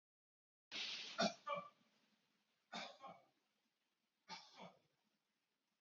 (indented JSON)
{
  "three_cough_length": "5.8 s",
  "three_cough_amplitude": 1511,
  "three_cough_signal_mean_std_ratio": 0.33,
  "survey_phase": "beta (2021-08-13 to 2022-03-07)",
  "age": "45-64",
  "gender": "Male",
  "wearing_mask": "No",
  "symptom_runny_or_blocked_nose": true,
  "symptom_shortness_of_breath": true,
  "symptom_fatigue": true,
  "symptom_headache": true,
  "symptom_other": true,
  "smoker_status": "Never smoked",
  "respiratory_condition_asthma": true,
  "respiratory_condition_other": false,
  "recruitment_source": "Test and Trace",
  "submission_delay": "1 day",
  "covid_test_result": "Positive",
  "covid_test_method": "RT-qPCR",
  "covid_ct_value": 21.6,
  "covid_ct_gene": "ORF1ab gene"
}